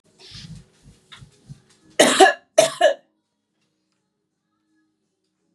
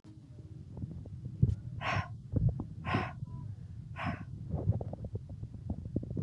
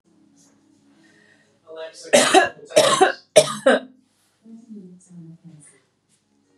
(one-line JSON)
{"cough_length": "5.5 s", "cough_amplitude": 32767, "cough_signal_mean_std_ratio": 0.26, "exhalation_length": "6.2 s", "exhalation_amplitude": 6873, "exhalation_signal_mean_std_ratio": 0.67, "three_cough_length": "6.6 s", "three_cough_amplitude": 32767, "three_cough_signal_mean_std_ratio": 0.33, "survey_phase": "beta (2021-08-13 to 2022-03-07)", "age": "18-44", "gender": "Female", "wearing_mask": "No", "symptom_none": true, "smoker_status": "Never smoked", "respiratory_condition_asthma": false, "respiratory_condition_other": false, "recruitment_source": "REACT", "submission_delay": "4 days", "covid_test_result": "Negative", "covid_test_method": "RT-qPCR", "influenza_a_test_result": "Negative", "influenza_b_test_result": "Negative"}